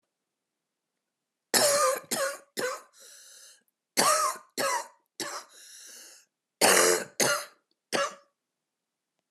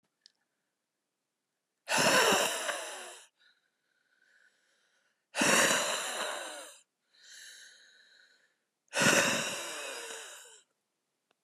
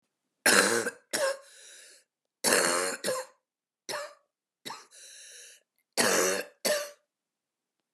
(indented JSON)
{
  "three_cough_length": "9.3 s",
  "three_cough_amplitude": 18115,
  "three_cough_signal_mean_std_ratio": 0.42,
  "exhalation_length": "11.4 s",
  "exhalation_amplitude": 8902,
  "exhalation_signal_mean_std_ratio": 0.41,
  "cough_length": "7.9 s",
  "cough_amplitude": 19588,
  "cough_signal_mean_std_ratio": 0.43,
  "survey_phase": "alpha (2021-03-01 to 2021-08-12)",
  "age": "45-64",
  "gender": "Female",
  "wearing_mask": "No",
  "symptom_fatigue": true,
  "symptom_headache": true,
  "symptom_change_to_sense_of_smell_or_taste": true,
  "smoker_status": "Current smoker (11 or more cigarettes per day)",
  "respiratory_condition_asthma": true,
  "respiratory_condition_other": false,
  "recruitment_source": "Test and Trace",
  "submission_delay": "2 days",
  "covid_test_result": "Positive",
  "covid_test_method": "RT-qPCR",
  "covid_ct_value": 20.5,
  "covid_ct_gene": "ORF1ab gene",
  "covid_ct_mean": 21.1,
  "covid_viral_load": "120000 copies/ml",
  "covid_viral_load_category": "Low viral load (10K-1M copies/ml)"
}